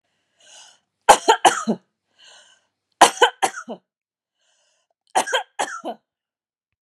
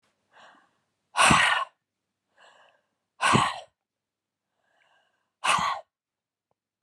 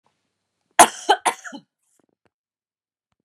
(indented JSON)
{
  "three_cough_length": "6.8 s",
  "three_cough_amplitude": 32768,
  "three_cough_signal_mean_std_ratio": 0.27,
  "exhalation_length": "6.8 s",
  "exhalation_amplitude": 16282,
  "exhalation_signal_mean_std_ratio": 0.32,
  "cough_length": "3.2 s",
  "cough_amplitude": 32768,
  "cough_signal_mean_std_ratio": 0.2,
  "survey_phase": "beta (2021-08-13 to 2022-03-07)",
  "age": "45-64",
  "gender": "Female",
  "wearing_mask": "No",
  "symptom_none": true,
  "smoker_status": "Never smoked",
  "respiratory_condition_asthma": false,
  "respiratory_condition_other": false,
  "recruitment_source": "REACT",
  "submission_delay": "6 days",
  "covid_test_result": "Negative",
  "covid_test_method": "RT-qPCR"
}